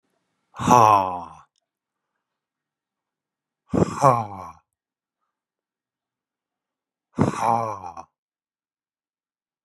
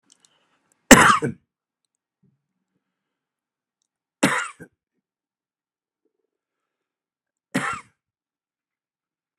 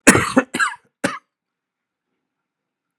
{
  "exhalation_length": "9.6 s",
  "exhalation_amplitude": 28698,
  "exhalation_signal_mean_std_ratio": 0.28,
  "three_cough_length": "9.4 s",
  "three_cough_amplitude": 32768,
  "three_cough_signal_mean_std_ratio": 0.18,
  "cough_length": "3.0 s",
  "cough_amplitude": 32768,
  "cough_signal_mean_std_ratio": 0.29,
  "survey_phase": "beta (2021-08-13 to 2022-03-07)",
  "age": "45-64",
  "gender": "Male",
  "wearing_mask": "No",
  "symptom_cough_any": true,
  "symptom_sore_throat": true,
  "symptom_headache": true,
  "symptom_onset": "6 days",
  "smoker_status": "Never smoked",
  "respiratory_condition_asthma": false,
  "respiratory_condition_other": false,
  "recruitment_source": "REACT",
  "submission_delay": "1 day",
  "covid_test_result": "Negative",
  "covid_test_method": "RT-qPCR"
}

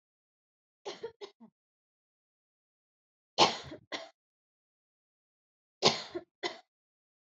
{
  "three_cough_length": "7.3 s",
  "three_cough_amplitude": 16575,
  "three_cough_signal_mean_std_ratio": 0.2,
  "survey_phase": "beta (2021-08-13 to 2022-03-07)",
  "age": "18-44",
  "gender": "Female",
  "wearing_mask": "No",
  "symptom_cough_any": true,
  "symptom_sore_throat": true,
  "symptom_onset": "12 days",
  "smoker_status": "Never smoked",
  "respiratory_condition_asthma": false,
  "respiratory_condition_other": false,
  "recruitment_source": "REACT",
  "submission_delay": "1 day",
  "covid_test_result": "Negative",
  "covid_test_method": "RT-qPCR",
  "influenza_a_test_result": "Negative",
  "influenza_b_test_result": "Negative"
}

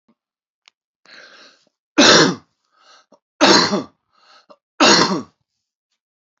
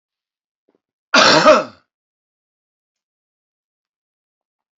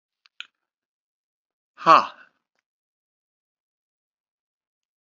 {
  "three_cough_length": "6.4 s",
  "three_cough_amplitude": 31146,
  "three_cough_signal_mean_std_ratio": 0.34,
  "cough_length": "4.8 s",
  "cough_amplitude": 30410,
  "cough_signal_mean_std_ratio": 0.26,
  "exhalation_length": "5.0 s",
  "exhalation_amplitude": 28167,
  "exhalation_signal_mean_std_ratio": 0.14,
  "survey_phase": "alpha (2021-03-01 to 2021-08-12)",
  "age": "45-64",
  "gender": "Male",
  "wearing_mask": "No",
  "symptom_cough_any": true,
  "symptom_fatigue": true,
  "symptom_onset": "33 days",
  "smoker_status": "Current smoker (11 or more cigarettes per day)",
  "respiratory_condition_asthma": false,
  "respiratory_condition_other": false,
  "recruitment_source": "Test and Trace",
  "submission_delay": "28 days",
  "covid_test_result": "Negative",
  "covid_test_method": "RT-qPCR"
}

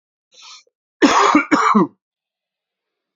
{
  "cough_length": "3.2 s",
  "cough_amplitude": 27146,
  "cough_signal_mean_std_ratio": 0.42,
  "survey_phase": "beta (2021-08-13 to 2022-03-07)",
  "age": "45-64",
  "gender": "Male",
  "wearing_mask": "No",
  "symptom_cough_any": true,
  "symptom_runny_or_blocked_nose": true,
  "symptom_headache": true,
  "symptom_onset": "2 days",
  "smoker_status": "Current smoker (1 to 10 cigarettes per day)",
  "respiratory_condition_asthma": false,
  "respiratory_condition_other": false,
  "recruitment_source": "Test and Trace",
  "submission_delay": "2 days",
  "covid_test_result": "Positive",
  "covid_test_method": "RT-qPCR",
  "covid_ct_value": 15.5,
  "covid_ct_gene": "ORF1ab gene",
  "covid_ct_mean": 16.5,
  "covid_viral_load": "3800000 copies/ml",
  "covid_viral_load_category": "High viral load (>1M copies/ml)"
}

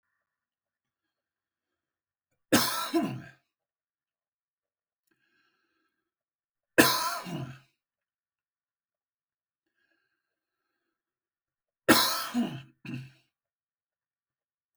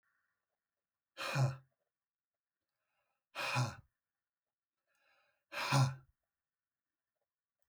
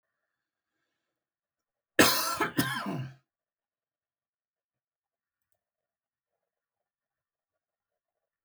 {
  "three_cough_length": "14.8 s",
  "three_cough_amplitude": 18484,
  "three_cough_signal_mean_std_ratio": 0.24,
  "exhalation_length": "7.7 s",
  "exhalation_amplitude": 3438,
  "exhalation_signal_mean_std_ratio": 0.29,
  "cough_length": "8.4 s",
  "cough_amplitude": 15712,
  "cough_signal_mean_std_ratio": 0.22,
  "survey_phase": "alpha (2021-03-01 to 2021-08-12)",
  "age": "45-64",
  "gender": "Male",
  "wearing_mask": "No",
  "symptom_none": true,
  "smoker_status": "Current smoker (e-cigarettes or vapes only)",
  "respiratory_condition_asthma": false,
  "respiratory_condition_other": false,
  "recruitment_source": "REACT",
  "submission_delay": "2 days",
  "covid_test_result": "Negative",
  "covid_test_method": "RT-qPCR"
}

